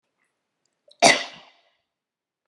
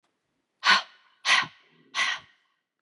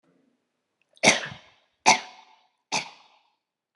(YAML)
cough_length: 2.5 s
cough_amplitude: 32166
cough_signal_mean_std_ratio: 0.21
exhalation_length: 2.8 s
exhalation_amplitude: 19831
exhalation_signal_mean_std_ratio: 0.35
three_cough_length: 3.8 s
three_cough_amplitude: 25369
three_cough_signal_mean_std_ratio: 0.24
survey_phase: beta (2021-08-13 to 2022-03-07)
age: 45-64
gender: Female
wearing_mask: 'No'
symptom_none: true
smoker_status: Never smoked
respiratory_condition_asthma: false
respiratory_condition_other: false
recruitment_source: REACT
submission_delay: 3 days
covid_test_result: Negative
covid_test_method: RT-qPCR